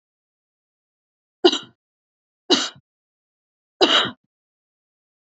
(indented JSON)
{
  "three_cough_length": "5.4 s",
  "three_cough_amplitude": 30210,
  "three_cough_signal_mean_std_ratio": 0.24,
  "survey_phase": "alpha (2021-03-01 to 2021-08-12)",
  "age": "18-44",
  "gender": "Female",
  "wearing_mask": "No",
  "symptom_none": true,
  "smoker_status": "Never smoked",
  "respiratory_condition_asthma": false,
  "respiratory_condition_other": false,
  "recruitment_source": "REACT",
  "submission_delay": "2 days",
  "covid_test_result": "Negative",
  "covid_test_method": "RT-qPCR"
}